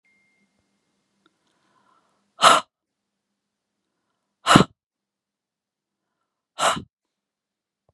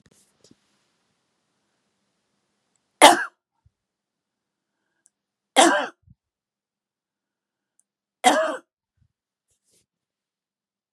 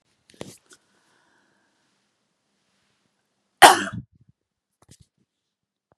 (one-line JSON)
{"exhalation_length": "7.9 s", "exhalation_amplitude": 32768, "exhalation_signal_mean_std_ratio": 0.18, "three_cough_length": "10.9 s", "three_cough_amplitude": 32768, "three_cough_signal_mean_std_ratio": 0.19, "cough_length": "6.0 s", "cough_amplitude": 32768, "cough_signal_mean_std_ratio": 0.14, "survey_phase": "beta (2021-08-13 to 2022-03-07)", "age": "45-64", "gender": "Female", "wearing_mask": "No", "symptom_cough_any": true, "symptom_sore_throat": true, "symptom_other": true, "smoker_status": "Never smoked", "respiratory_condition_asthma": false, "respiratory_condition_other": false, "recruitment_source": "Test and Trace", "submission_delay": "2 days", "covid_test_result": "Positive", "covid_test_method": "RT-qPCR", "covid_ct_value": 22.2, "covid_ct_gene": "ORF1ab gene", "covid_ct_mean": 22.3, "covid_viral_load": "48000 copies/ml", "covid_viral_load_category": "Low viral load (10K-1M copies/ml)"}